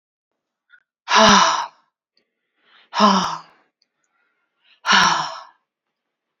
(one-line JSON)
{"exhalation_length": "6.4 s", "exhalation_amplitude": 28919, "exhalation_signal_mean_std_ratio": 0.36, "survey_phase": "beta (2021-08-13 to 2022-03-07)", "age": "18-44", "gender": "Female", "wearing_mask": "No", "symptom_abdominal_pain": true, "symptom_diarrhoea": true, "symptom_fatigue": true, "symptom_headache": true, "smoker_status": "Never smoked", "respiratory_condition_asthma": false, "respiratory_condition_other": false, "recruitment_source": "Test and Trace", "submission_delay": "3 days", "covid_test_result": "Negative", "covid_test_method": "RT-qPCR"}